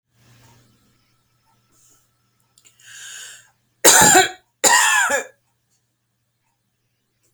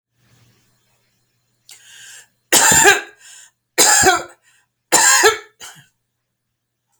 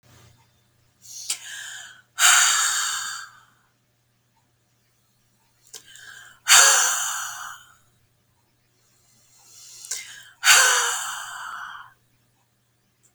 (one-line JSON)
{"cough_length": "7.3 s", "cough_amplitude": 32768, "cough_signal_mean_std_ratio": 0.3, "three_cough_length": "7.0 s", "three_cough_amplitude": 32768, "three_cough_signal_mean_std_ratio": 0.37, "exhalation_length": "13.1 s", "exhalation_amplitude": 32767, "exhalation_signal_mean_std_ratio": 0.36, "survey_phase": "beta (2021-08-13 to 2022-03-07)", "age": "65+", "gender": "Female", "wearing_mask": "No", "symptom_none": true, "smoker_status": "Never smoked", "respiratory_condition_asthma": false, "respiratory_condition_other": false, "recruitment_source": "REACT", "submission_delay": "2 days", "covid_test_result": "Negative", "covid_test_method": "RT-qPCR"}